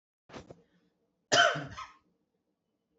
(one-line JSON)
{"cough_length": "3.0 s", "cough_amplitude": 9777, "cough_signal_mean_std_ratio": 0.27, "survey_phase": "beta (2021-08-13 to 2022-03-07)", "age": "18-44", "gender": "Female", "wearing_mask": "No", "symptom_none": true, "symptom_onset": "4 days", "smoker_status": "Never smoked", "respiratory_condition_asthma": false, "respiratory_condition_other": false, "recruitment_source": "REACT", "submission_delay": "2 days", "covid_test_result": "Negative", "covid_test_method": "RT-qPCR", "influenza_a_test_result": "Unknown/Void", "influenza_b_test_result": "Unknown/Void"}